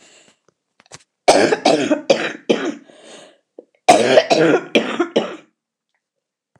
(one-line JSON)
{"three_cough_length": "6.6 s", "three_cough_amplitude": 29204, "three_cough_signal_mean_std_ratio": 0.44, "survey_phase": "beta (2021-08-13 to 2022-03-07)", "age": "65+", "gender": "Female", "wearing_mask": "No", "symptom_cough_any": true, "symptom_new_continuous_cough": true, "symptom_runny_or_blocked_nose": true, "symptom_fatigue": true, "symptom_headache": true, "symptom_change_to_sense_of_smell_or_taste": true, "symptom_loss_of_taste": true, "symptom_other": true, "symptom_onset": "6 days", "smoker_status": "Ex-smoker", "respiratory_condition_asthma": true, "respiratory_condition_other": false, "recruitment_source": "REACT", "submission_delay": "0 days", "covid_test_result": "Negative", "covid_test_method": "RT-qPCR", "influenza_a_test_result": "Negative", "influenza_b_test_result": "Negative"}